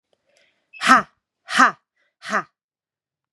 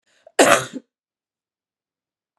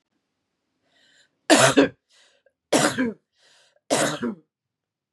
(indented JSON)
{
  "exhalation_length": "3.3 s",
  "exhalation_amplitude": 32767,
  "exhalation_signal_mean_std_ratio": 0.28,
  "cough_length": "2.4 s",
  "cough_amplitude": 32767,
  "cough_signal_mean_std_ratio": 0.25,
  "three_cough_length": "5.1 s",
  "three_cough_amplitude": 27483,
  "three_cough_signal_mean_std_ratio": 0.34,
  "survey_phase": "beta (2021-08-13 to 2022-03-07)",
  "age": "45-64",
  "gender": "Female",
  "wearing_mask": "No",
  "symptom_cough_any": true,
  "symptom_shortness_of_breath": true,
  "symptom_sore_throat": true,
  "symptom_fatigue": true,
  "symptom_fever_high_temperature": true,
  "symptom_headache": true,
  "symptom_other": true,
  "symptom_onset": "3 days",
  "smoker_status": "Never smoked",
  "respiratory_condition_asthma": true,
  "respiratory_condition_other": false,
  "recruitment_source": "Test and Trace",
  "submission_delay": "2 days",
  "covid_test_result": "Positive",
  "covid_test_method": "RT-qPCR",
  "covid_ct_value": 26.0,
  "covid_ct_gene": "N gene"
}